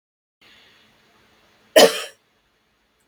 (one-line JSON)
{"cough_length": "3.1 s", "cough_amplitude": 32768, "cough_signal_mean_std_ratio": 0.2, "survey_phase": "beta (2021-08-13 to 2022-03-07)", "age": "18-44", "gender": "Female", "wearing_mask": "No", "symptom_runny_or_blocked_nose": true, "symptom_fatigue": true, "symptom_headache": true, "smoker_status": "Never smoked", "respiratory_condition_asthma": false, "respiratory_condition_other": false, "recruitment_source": "Test and Trace", "submission_delay": "1 day", "covid_test_result": "Negative", "covid_test_method": "RT-qPCR"}